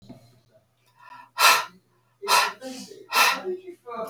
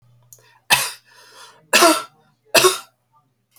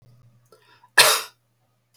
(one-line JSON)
{"exhalation_length": "4.1 s", "exhalation_amplitude": 21670, "exhalation_signal_mean_std_ratio": 0.42, "three_cough_length": "3.6 s", "three_cough_amplitude": 32768, "three_cough_signal_mean_std_ratio": 0.34, "cough_length": "2.0 s", "cough_amplitude": 32768, "cough_signal_mean_std_ratio": 0.26, "survey_phase": "alpha (2021-03-01 to 2021-08-12)", "age": "65+", "gender": "Female", "wearing_mask": "No", "symptom_none": true, "smoker_status": "Never smoked", "respiratory_condition_asthma": false, "respiratory_condition_other": false, "recruitment_source": "REACT", "submission_delay": "2 days", "covid_test_result": "Negative", "covid_test_method": "RT-qPCR"}